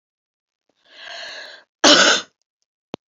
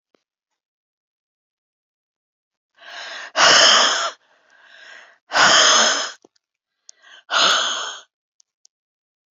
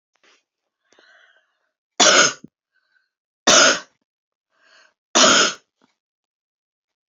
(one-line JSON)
{"cough_length": "3.1 s", "cough_amplitude": 32768, "cough_signal_mean_std_ratio": 0.31, "exhalation_length": "9.3 s", "exhalation_amplitude": 29626, "exhalation_signal_mean_std_ratio": 0.38, "three_cough_length": "7.1 s", "three_cough_amplitude": 32768, "three_cough_signal_mean_std_ratio": 0.3, "survey_phase": "beta (2021-08-13 to 2022-03-07)", "age": "65+", "gender": "Female", "wearing_mask": "No", "symptom_none": true, "smoker_status": "Never smoked", "respiratory_condition_asthma": false, "respiratory_condition_other": false, "recruitment_source": "REACT", "submission_delay": "5 days", "covid_test_result": "Negative", "covid_test_method": "RT-qPCR", "influenza_a_test_result": "Negative", "influenza_b_test_result": "Negative"}